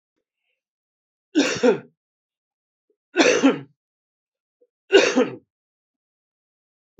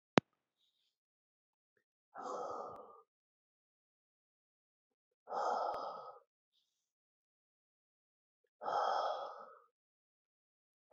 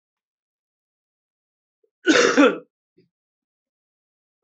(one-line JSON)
{"three_cough_length": "7.0 s", "three_cough_amplitude": 27502, "three_cough_signal_mean_std_ratio": 0.31, "exhalation_length": "10.9 s", "exhalation_amplitude": 16300, "exhalation_signal_mean_std_ratio": 0.3, "cough_length": "4.4 s", "cough_amplitude": 23981, "cough_signal_mean_std_ratio": 0.25, "survey_phase": "beta (2021-08-13 to 2022-03-07)", "age": "45-64", "gender": "Male", "wearing_mask": "No", "symptom_runny_or_blocked_nose": true, "symptom_sore_throat": true, "smoker_status": "Never smoked", "respiratory_condition_asthma": false, "respiratory_condition_other": false, "recruitment_source": "Test and Trace", "submission_delay": "2 days", "covid_test_result": "Positive", "covid_test_method": "LFT"}